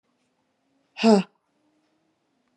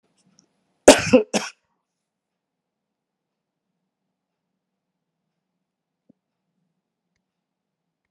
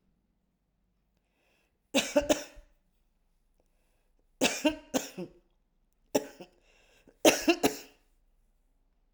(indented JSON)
{
  "exhalation_length": "2.6 s",
  "exhalation_amplitude": 21314,
  "exhalation_signal_mean_std_ratio": 0.22,
  "cough_length": "8.1 s",
  "cough_amplitude": 32768,
  "cough_signal_mean_std_ratio": 0.14,
  "three_cough_length": "9.1 s",
  "three_cough_amplitude": 17581,
  "three_cough_signal_mean_std_ratio": 0.26,
  "survey_phase": "alpha (2021-03-01 to 2021-08-12)",
  "age": "45-64",
  "gender": "Female",
  "wearing_mask": "No",
  "symptom_loss_of_taste": true,
  "smoker_status": "Ex-smoker",
  "respiratory_condition_asthma": false,
  "respiratory_condition_other": false,
  "recruitment_source": "REACT",
  "submission_delay": "1 day",
  "covid_test_result": "Negative",
  "covid_test_method": "RT-qPCR"
}